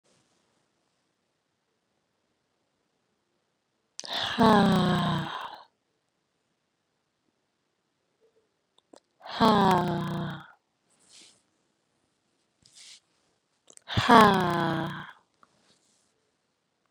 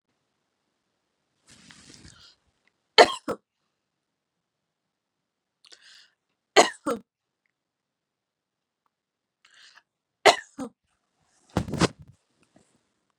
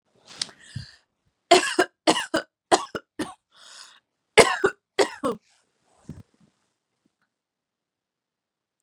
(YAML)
exhalation_length: 16.9 s
exhalation_amplitude: 25509
exhalation_signal_mean_std_ratio: 0.29
three_cough_length: 13.2 s
three_cough_amplitude: 32729
three_cough_signal_mean_std_ratio: 0.15
cough_length: 8.8 s
cough_amplitude: 32767
cough_signal_mean_std_ratio: 0.25
survey_phase: beta (2021-08-13 to 2022-03-07)
age: 18-44
gender: Female
wearing_mask: 'No'
symptom_none: true
symptom_onset: 6 days
smoker_status: Never smoked
respiratory_condition_asthma: false
respiratory_condition_other: false
recruitment_source: REACT
submission_delay: 1 day
covid_test_result: Negative
covid_test_method: RT-qPCR